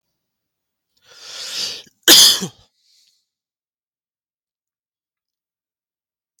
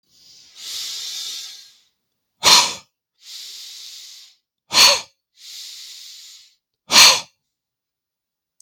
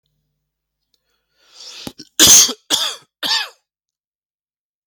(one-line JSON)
{"cough_length": "6.4 s", "cough_amplitude": 32768, "cough_signal_mean_std_ratio": 0.21, "exhalation_length": "8.6 s", "exhalation_amplitude": 32768, "exhalation_signal_mean_std_ratio": 0.3, "three_cough_length": "4.9 s", "three_cough_amplitude": 32768, "three_cough_signal_mean_std_ratio": 0.29, "survey_phase": "beta (2021-08-13 to 2022-03-07)", "age": "18-44", "gender": "Male", "wearing_mask": "No", "symptom_cough_any": true, "symptom_runny_or_blocked_nose": true, "symptom_sore_throat": true, "symptom_other": true, "symptom_onset": "4 days", "smoker_status": "Ex-smoker", "respiratory_condition_asthma": false, "respiratory_condition_other": false, "recruitment_source": "Test and Trace", "submission_delay": "3 days", "covid_test_result": "Positive", "covid_test_method": "RT-qPCR", "covid_ct_value": 18.7, "covid_ct_gene": "ORF1ab gene"}